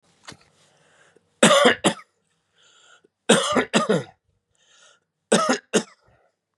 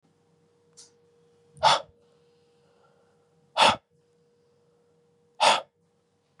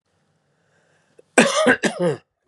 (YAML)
three_cough_length: 6.6 s
three_cough_amplitude: 31904
three_cough_signal_mean_std_ratio: 0.35
exhalation_length: 6.4 s
exhalation_amplitude: 16626
exhalation_signal_mean_std_ratio: 0.24
cough_length: 2.5 s
cough_amplitude: 32508
cough_signal_mean_std_ratio: 0.39
survey_phase: beta (2021-08-13 to 2022-03-07)
age: 45-64
gender: Male
wearing_mask: 'No'
symptom_cough_any: true
symptom_sore_throat: true
symptom_onset: 7 days
smoker_status: Never smoked
respiratory_condition_asthma: false
respiratory_condition_other: false
recruitment_source: REACT
submission_delay: 4 days
covid_test_result: Negative
covid_test_method: RT-qPCR
influenza_a_test_result: Negative
influenza_b_test_result: Negative